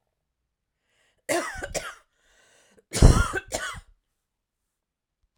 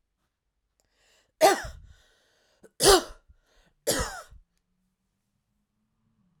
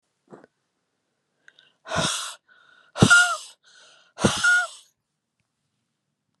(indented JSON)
{
  "cough_length": "5.4 s",
  "cough_amplitude": 28442,
  "cough_signal_mean_std_ratio": 0.25,
  "three_cough_length": "6.4 s",
  "three_cough_amplitude": 20673,
  "three_cough_signal_mean_std_ratio": 0.24,
  "exhalation_length": "6.4 s",
  "exhalation_amplitude": 30907,
  "exhalation_signal_mean_std_ratio": 0.32,
  "survey_phase": "alpha (2021-03-01 to 2021-08-12)",
  "age": "45-64",
  "gender": "Female",
  "wearing_mask": "No",
  "symptom_none": true,
  "smoker_status": "Ex-smoker",
  "respiratory_condition_asthma": false,
  "respiratory_condition_other": false,
  "recruitment_source": "REACT",
  "submission_delay": "1 day",
  "covid_test_result": "Negative",
  "covid_test_method": "RT-qPCR"
}